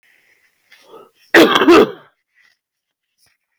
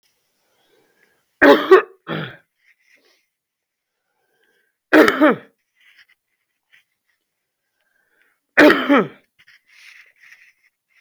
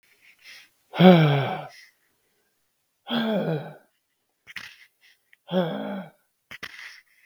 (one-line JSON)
{"cough_length": "3.6 s", "cough_amplitude": 32766, "cough_signal_mean_std_ratio": 0.33, "three_cough_length": "11.0 s", "three_cough_amplitude": 32766, "three_cough_signal_mean_std_ratio": 0.26, "exhalation_length": "7.3 s", "exhalation_amplitude": 32766, "exhalation_signal_mean_std_ratio": 0.32, "survey_phase": "beta (2021-08-13 to 2022-03-07)", "age": "18-44", "gender": "Male", "wearing_mask": "No", "symptom_sore_throat": true, "symptom_diarrhoea": true, "symptom_fatigue": true, "symptom_fever_high_temperature": true, "symptom_other": true, "smoker_status": "Never smoked", "respiratory_condition_asthma": false, "respiratory_condition_other": false, "recruitment_source": "Test and Trace", "submission_delay": "3 days", "covid_test_result": "Positive", "covid_test_method": "LFT"}